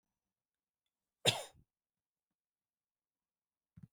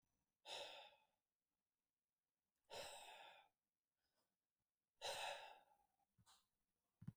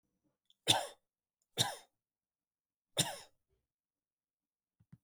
{
  "cough_length": "3.9 s",
  "cough_amplitude": 5948,
  "cough_signal_mean_std_ratio": 0.14,
  "exhalation_length": "7.2 s",
  "exhalation_amplitude": 452,
  "exhalation_signal_mean_std_ratio": 0.37,
  "three_cough_length": "5.0 s",
  "three_cough_amplitude": 7260,
  "three_cough_signal_mean_std_ratio": 0.22,
  "survey_phase": "beta (2021-08-13 to 2022-03-07)",
  "age": "18-44",
  "gender": "Male",
  "wearing_mask": "No",
  "symptom_none": true,
  "smoker_status": "Never smoked",
  "respiratory_condition_asthma": false,
  "respiratory_condition_other": false,
  "recruitment_source": "REACT",
  "submission_delay": "1 day",
  "covid_test_result": "Negative",
  "covid_test_method": "RT-qPCR",
  "influenza_a_test_result": "Negative",
  "influenza_b_test_result": "Negative"
}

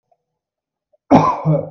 {
  "cough_length": "1.7 s",
  "cough_amplitude": 32768,
  "cough_signal_mean_std_ratio": 0.41,
  "survey_phase": "beta (2021-08-13 to 2022-03-07)",
  "age": "18-44",
  "gender": "Male",
  "wearing_mask": "No",
  "symptom_none": true,
  "smoker_status": "Never smoked",
  "respiratory_condition_asthma": false,
  "respiratory_condition_other": false,
  "recruitment_source": "REACT",
  "submission_delay": "1 day",
  "covid_test_result": "Negative",
  "covid_test_method": "RT-qPCR"
}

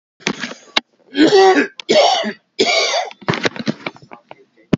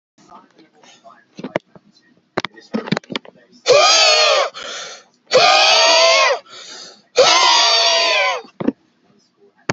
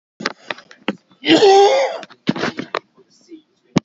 {
  "three_cough_length": "4.8 s",
  "three_cough_amplitude": 32767,
  "three_cough_signal_mean_std_ratio": 0.52,
  "exhalation_length": "9.7 s",
  "exhalation_amplitude": 32768,
  "exhalation_signal_mean_std_ratio": 0.54,
  "cough_length": "3.8 s",
  "cough_amplitude": 28554,
  "cough_signal_mean_std_ratio": 0.43,
  "survey_phase": "beta (2021-08-13 to 2022-03-07)",
  "age": "45-64",
  "gender": "Male",
  "wearing_mask": "No",
  "symptom_none": true,
  "smoker_status": "Ex-smoker",
  "respiratory_condition_asthma": false,
  "respiratory_condition_other": false,
  "recruitment_source": "REACT",
  "submission_delay": "1 day",
  "covid_test_result": "Negative",
  "covid_test_method": "RT-qPCR",
  "influenza_a_test_result": "Negative",
  "influenza_b_test_result": "Negative"
}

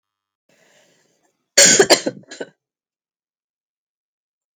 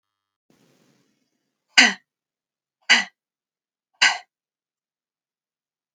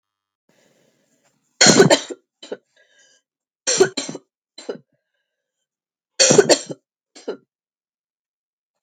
{
  "cough_length": "4.6 s",
  "cough_amplitude": 32768,
  "cough_signal_mean_std_ratio": 0.24,
  "exhalation_length": "5.9 s",
  "exhalation_amplitude": 32768,
  "exhalation_signal_mean_std_ratio": 0.19,
  "three_cough_length": "8.8 s",
  "three_cough_amplitude": 32768,
  "three_cough_signal_mean_std_ratio": 0.27,
  "survey_phase": "beta (2021-08-13 to 2022-03-07)",
  "age": "45-64",
  "gender": "Female",
  "wearing_mask": "No",
  "symptom_cough_any": true,
  "symptom_new_continuous_cough": true,
  "symptom_runny_or_blocked_nose": true,
  "symptom_sore_throat": true,
  "symptom_headache": true,
  "symptom_other": true,
  "symptom_onset": "3 days",
  "smoker_status": "Never smoked",
  "respiratory_condition_asthma": false,
  "respiratory_condition_other": false,
  "recruitment_source": "Test and Trace",
  "submission_delay": "2 days",
  "covid_test_result": "Positive",
  "covid_test_method": "RT-qPCR",
  "covid_ct_value": 18.0,
  "covid_ct_gene": "ORF1ab gene",
  "covid_ct_mean": 18.9,
  "covid_viral_load": "650000 copies/ml",
  "covid_viral_load_category": "Low viral load (10K-1M copies/ml)"
}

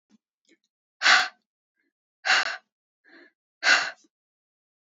{
  "exhalation_length": "4.9 s",
  "exhalation_amplitude": 17867,
  "exhalation_signal_mean_std_ratio": 0.29,
  "survey_phase": "beta (2021-08-13 to 2022-03-07)",
  "age": "18-44",
  "gender": "Female",
  "wearing_mask": "No",
  "symptom_cough_any": true,
  "symptom_runny_or_blocked_nose": true,
  "symptom_fatigue": true,
  "symptom_fever_high_temperature": true,
  "symptom_other": true,
  "smoker_status": "Never smoked",
  "respiratory_condition_asthma": false,
  "respiratory_condition_other": false,
  "recruitment_source": "Test and Trace",
  "submission_delay": "2 days",
  "covid_test_result": "Positive",
  "covid_test_method": "RT-qPCR"
}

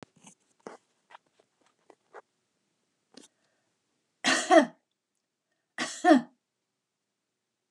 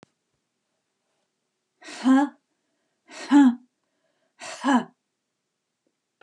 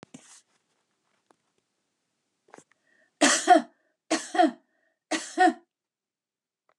{
  "cough_length": "7.7 s",
  "cough_amplitude": 16542,
  "cough_signal_mean_std_ratio": 0.21,
  "exhalation_length": "6.2 s",
  "exhalation_amplitude": 14382,
  "exhalation_signal_mean_std_ratio": 0.29,
  "three_cough_length": "6.8 s",
  "three_cough_amplitude": 17997,
  "three_cough_signal_mean_std_ratio": 0.27,
  "survey_phase": "beta (2021-08-13 to 2022-03-07)",
  "age": "65+",
  "gender": "Female",
  "wearing_mask": "No",
  "symptom_none": true,
  "smoker_status": "Never smoked",
  "respiratory_condition_asthma": false,
  "respiratory_condition_other": false,
  "recruitment_source": "REACT",
  "submission_delay": "2 days",
  "covid_test_result": "Negative",
  "covid_test_method": "RT-qPCR",
  "influenza_a_test_result": "Negative",
  "influenza_b_test_result": "Negative"
}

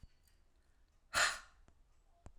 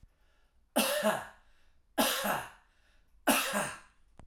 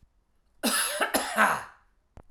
{
  "exhalation_length": "2.4 s",
  "exhalation_amplitude": 3405,
  "exhalation_signal_mean_std_ratio": 0.29,
  "three_cough_length": "4.3 s",
  "three_cough_amplitude": 6940,
  "three_cough_signal_mean_std_ratio": 0.48,
  "cough_length": "2.3 s",
  "cough_amplitude": 15969,
  "cough_signal_mean_std_ratio": 0.51,
  "survey_phase": "alpha (2021-03-01 to 2021-08-12)",
  "age": "45-64",
  "gender": "Male",
  "wearing_mask": "No",
  "symptom_none": true,
  "smoker_status": "Never smoked",
  "respiratory_condition_asthma": false,
  "respiratory_condition_other": false,
  "recruitment_source": "REACT",
  "submission_delay": "1 day",
  "covid_test_result": "Negative",
  "covid_test_method": "RT-qPCR"
}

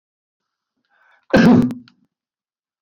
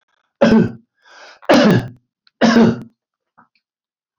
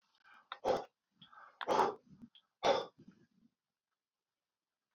{
  "cough_length": "2.8 s",
  "cough_amplitude": 27465,
  "cough_signal_mean_std_ratio": 0.31,
  "three_cough_length": "4.2 s",
  "three_cough_amplitude": 30126,
  "three_cough_signal_mean_std_ratio": 0.42,
  "exhalation_length": "4.9 s",
  "exhalation_amplitude": 4025,
  "exhalation_signal_mean_std_ratio": 0.31,
  "survey_phase": "beta (2021-08-13 to 2022-03-07)",
  "age": "65+",
  "gender": "Male",
  "wearing_mask": "No",
  "symptom_none": true,
  "symptom_onset": "5 days",
  "smoker_status": "Never smoked",
  "respiratory_condition_asthma": false,
  "respiratory_condition_other": false,
  "recruitment_source": "REACT",
  "submission_delay": "1 day",
  "covid_test_result": "Negative",
  "covid_test_method": "RT-qPCR"
}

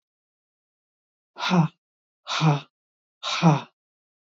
{
  "exhalation_length": "4.4 s",
  "exhalation_amplitude": 16732,
  "exhalation_signal_mean_std_ratio": 0.35,
  "survey_phase": "beta (2021-08-13 to 2022-03-07)",
  "age": "65+",
  "gender": "Female",
  "wearing_mask": "No",
  "symptom_none": true,
  "smoker_status": "Ex-smoker",
  "respiratory_condition_asthma": false,
  "respiratory_condition_other": false,
  "recruitment_source": "REACT",
  "submission_delay": "2 days",
  "covid_test_result": "Negative",
  "covid_test_method": "RT-qPCR",
  "influenza_a_test_result": "Negative",
  "influenza_b_test_result": "Negative"
}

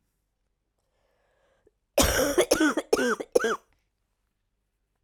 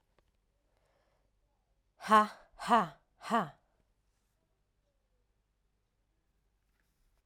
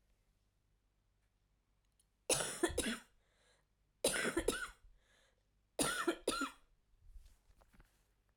{
  "cough_length": "5.0 s",
  "cough_amplitude": 16153,
  "cough_signal_mean_std_ratio": 0.38,
  "exhalation_length": "7.3 s",
  "exhalation_amplitude": 8508,
  "exhalation_signal_mean_std_ratio": 0.21,
  "three_cough_length": "8.4 s",
  "three_cough_amplitude": 3333,
  "three_cough_signal_mean_std_ratio": 0.37,
  "survey_phase": "alpha (2021-03-01 to 2021-08-12)",
  "age": "18-44",
  "gender": "Female",
  "wearing_mask": "No",
  "symptom_cough_any": true,
  "symptom_fatigue": true,
  "symptom_headache": true,
  "smoker_status": "Current smoker (1 to 10 cigarettes per day)",
  "respiratory_condition_asthma": false,
  "respiratory_condition_other": false,
  "recruitment_source": "Test and Trace",
  "submission_delay": "1 day",
  "covid_test_result": "Positive",
  "covid_test_method": "RT-qPCR",
  "covid_ct_value": 25.2,
  "covid_ct_gene": "ORF1ab gene",
  "covid_ct_mean": 25.9,
  "covid_viral_load": "3200 copies/ml",
  "covid_viral_load_category": "Minimal viral load (< 10K copies/ml)"
}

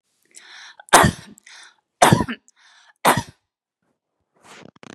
{
  "three_cough_length": "4.9 s",
  "three_cough_amplitude": 32768,
  "three_cough_signal_mean_std_ratio": 0.27,
  "survey_phase": "beta (2021-08-13 to 2022-03-07)",
  "age": "45-64",
  "gender": "Female",
  "wearing_mask": "No",
  "symptom_none": true,
  "smoker_status": "Never smoked",
  "respiratory_condition_asthma": false,
  "respiratory_condition_other": false,
  "recruitment_source": "REACT",
  "submission_delay": "1 day",
  "covid_test_result": "Negative",
  "covid_test_method": "RT-qPCR",
  "influenza_a_test_result": "Negative",
  "influenza_b_test_result": "Negative"
}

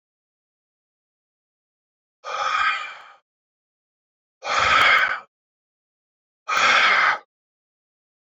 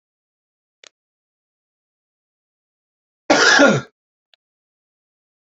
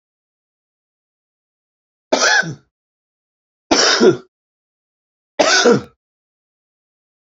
{
  "exhalation_length": "8.3 s",
  "exhalation_amplitude": 20281,
  "exhalation_signal_mean_std_ratio": 0.39,
  "cough_length": "5.5 s",
  "cough_amplitude": 31574,
  "cough_signal_mean_std_ratio": 0.24,
  "three_cough_length": "7.3 s",
  "three_cough_amplitude": 31171,
  "three_cough_signal_mean_std_ratio": 0.33,
  "survey_phase": "beta (2021-08-13 to 2022-03-07)",
  "age": "45-64",
  "gender": "Male",
  "wearing_mask": "No",
  "symptom_cough_any": true,
  "symptom_onset": "11 days",
  "smoker_status": "Ex-smoker",
  "respiratory_condition_asthma": false,
  "respiratory_condition_other": false,
  "recruitment_source": "REACT",
  "submission_delay": "2 days",
  "covid_test_result": "Positive",
  "covid_test_method": "RT-qPCR",
  "covid_ct_value": 28.0,
  "covid_ct_gene": "E gene",
  "influenza_a_test_result": "Negative",
  "influenza_b_test_result": "Negative"
}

